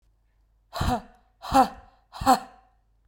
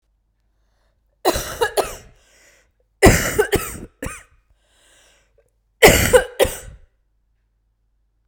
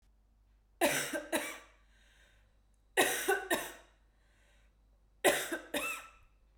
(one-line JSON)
{"exhalation_length": "3.1 s", "exhalation_amplitude": 18861, "exhalation_signal_mean_std_ratio": 0.33, "cough_length": "8.3 s", "cough_amplitude": 32768, "cough_signal_mean_std_ratio": 0.31, "three_cough_length": "6.6 s", "three_cough_amplitude": 8623, "three_cough_signal_mean_std_ratio": 0.41, "survey_phase": "beta (2021-08-13 to 2022-03-07)", "age": "18-44", "gender": "Female", "wearing_mask": "No", "symptom_cough_any": true, "symptom_sore_throat": true, "symptom_fatigue": true, "symptom_headache": true, "smoker_status": "Never smoked", "respiratory_condition_asthma": false, "respiratory_condition_other": false, "recruitment_source": "Test and Trace", "submission_delay": "2 days", "covid_test_result": "Positive", "covid_test_method": "ePCR"}